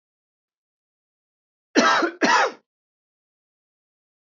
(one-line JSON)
{"cough_length": "4.4 s", "cough_amplitude": 21177, "cough_signal_mean_std_ratio": 0.31, "survey_phase": "beta (2021-08-13 to 2022-03-07)", "age": "45-64", "gender": "Male", "wearing_mask": "No", "symptom_none": true, "smoker_status": "Never smoked", "respiratory_condition_asthma": false, "respiratory_condition_other": false, "recruitment_source": "REACT", "submission_delay": "1 day", "covid_test_result": "Negative", "covid_test_method": "RT-qPCR"}